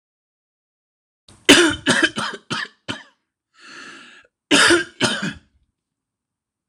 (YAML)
three_cough_length: 6.7 s
three_cough_amplitude: 26028
three_cough_signal_mean_std_ratio: 0.35
survey_phase: alpha (2021-03-01 to 2021-08-12)
age: 45-64
gender: Male
wearing_mask: 'No'
symptom_none: true
smoker_status: Ex-smoker
respiratory_condition_asthma: false
respiratory_condition_other: false
recruitment_source: REACT
submission_delay: 2 days
covid_test_result: Negative
covid_test_method: RT-qPCR